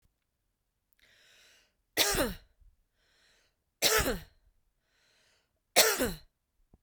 {"three_cough_length": "6.8 s", "three_cough_amplitude": 15353, "three_cough_signal_mean_std_ratio": 0.3, "survey_phase": "beta (2021-08-13 to 2022-03-07)", "age": "45-64", "gender": "Female", "wearing_mask": "No", "symptom_none": true, "smoker_status": "Never smoked", "respiratory_condition_asthma": false, "respiratory_condition_other": false, "recruitment_source": "REACT", "submission_delay": "0 days", "covid_test_result": "Negative", "covid_test_method": "RT-qPCR"}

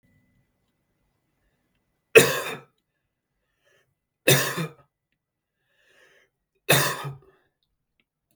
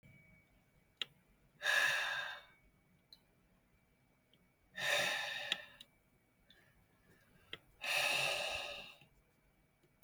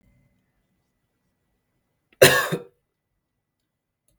{"three_cough_length": "8.4 s", "three_cough_amplitude": 32768, "three_cough_signal_mean_std_ratio": 0.23, "exhalation_length": "10.0 s", "exhalation_amplitude": 4159, "exhalation_signal_mean_std_ratio": 0.43, "cough_length": "4.2 s", "cough_amplitude": 32768, "cough_signal_mean_std_ratio": 0.19, "survey_phase": "beta (2021-08-13 to 2022-03-07)", "age": "18-44", "gender": "Male", "wearing_mask": "No", "symptom_none": true, "smoker_status": "Never smoked", "respiratory_condition_asthma": false, "respiratory_condition_other": false, "recruitment_source": "Test and Trace", "submission_delay": "1 day", "covid_test_result": "Positive", "covid_test_method": "ePCR"}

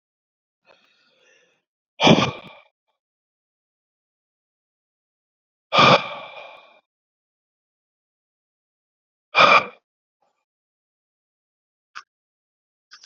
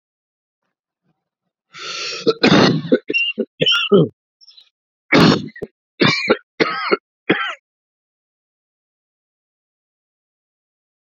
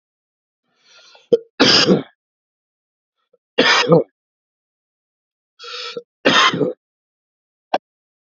{"exhalation_length": "13.1 s", "exhalation_amplitude": 28049, "exhalation_signal_mean_std_ratio": 0.21, "cough_length": "11.1 s", "cough_amplitude": 32189, "cough_signal_mean_std_ratio": 0.37, "three_cough_length": "8.3 s", "three_cough_amplitude": 30775, "three_cough_signal_mean_std_ratio": 0.33, "survey_phase": "alpha (2021-03-01 to 2021-08-12)", "age": "18-44", "gender": "Male", "wearing_mask": "No", "symptom_cough_any": true, "symptom_diarrhoea": true, "symptom_fatigue": true, "symptom_headache": true, "smoker_status": "Ex-smoker", "respiratory_condition_asthma": false, "respiratory_condition_other": false, "recruitment_source": "Test and Trace", "submission_delay": "2 days", "covid_test_result": "Positive", "covid_test_method": "RT-qPCR", "covid_ct_value": 15.4, "covid_ct_gene": "S gene", "covid_ct_mean": 15.7, "covid_viral_load": "7100000 copies/ml", "covid_viral_load_category": "High viral load (>1M copies/ml)"}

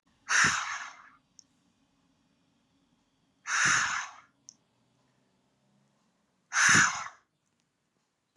{"exhalation_length": "8.4 s", "exhalation_amplitude": 10248, "exhalation_signal_mean_std_ratio": 0.34, "survey_phase": "beta (2021-08-13 to 2022-03-07)", "age": "18-44", "gender": "Female", "wearing_mask": "No", "symptom_cough_any": true, "symptom_runny_or_blocked_nose": true, "symptom_sore_throat": true, "symptom_headache": true, "smoker_status": "Never smoked", "respiratory_condition_asthma": false, "respiratory_condition_other": false, "recruitment_source": "Test and Trace", "submission_delay": "2 days", "covid_test_result": "Positive", "covid_test_method": "RT-qPCR", "covid_ct_value": 19.1, "covid_ct_gene": "ORF1ab gene"}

